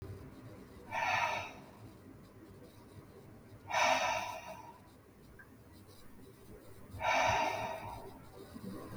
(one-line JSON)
{"exhalation_length": "9.0 s", "exhalation_amplitude": 4459, "exhalation_signal_mean_std_ratio": 0.55, "survey_phase": "beta (2021-08-13 to 2022-03-07)", "age": "45-64", "gender": "Male", "wearing_mask": "No", "symptom_sore_throat": true, "smoker_status": "Never smoked", "respiratory_condition_asthma": false, "respiratory_condition_other": false, "recruitment_source": "Test and Trace", "submission_delay": "3 days", "covid_test_result": "Negative", "covid_test_method": "RT-qPCR"}